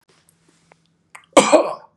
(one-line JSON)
{"three_cough_length": "2.0 s", "three_cough_amplitude": 32768, "three_cough_signal_mean_std_ratio": 0.29, "survey_phase": "beta (2021-08-13 to 2022-03-07)", "age": "18-44", "gender": "Male", "wearing_mask": "No", "symptom_none": true, "smoker_status": "Ex-smoker", "respiratory_condition_asthma": false, "respiratory_condition_other": false, "recruitment_source": "REACT", "submission_delay": "3 days", "covid_test_result": "Negative", "covid_test_method": "RT-qPCR", "influenza_a_test_result": "Unknown/Void", "influenza_b_test_result": "Unknown/Void"}